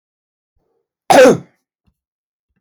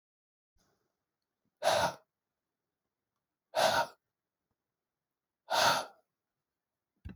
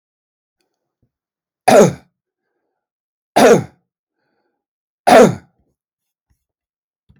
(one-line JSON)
{"cough_length": "2.6 s", "cough_amplitude": 32768, "cough_signal_mean_std_ratio": 0.28, "exhalation_length": "7.2 s", "exhalation_amplitude": 6715, "exhalation_signal_mean_std_ratio": 0.29, "three_cough_length": "7.2 s", "three_cough_amplitude": 32768, "three_cough_signal_mean_std_ratio": 0.27, "survey_phase": "beta (2021-08-13 to 2022-03-07)", "age": "45-64", "gender": "Male", "wearing_mask": "No", "symptom_none": true, "smoker_status": "Never smoked", "respiratory_condition_asthma": false, "respiratory_condition_other": false, "recruitment_source": "REACT", "submission_delay": "2 days", "covid_test_result": "Negative", "covid_test_method": "RT-qPCR", "influenza_a_test_result": "Negative", "influenza_b_test_result": "Negative"}